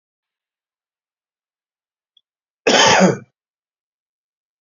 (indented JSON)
{
  "cough_length": "4.6 s",
  "cough_amplitude": 32767,
  "cough_signal_mean_std_ratio": 0.26,
  "survey_phase": "beta (2021-08-13 to 2022-03-07)",
  "age": "45-64",
  "gender": "Male",
  "wearing_mask": "No",
  "symptom_new_continuous_cough": true,
  "symptom_fatigue": true,
  "symptom_headache": true,
  "smoker_status": "Ex-smoker",
  "respiratory_condition_asthma": false,
  "respiratory_condition_other": false,
  "recruitment_source": "Test and Trace",
  "submission_delay": "2 days",
  "covid_test_result": "Positive",
  "covid_test_method": "ePCR"
}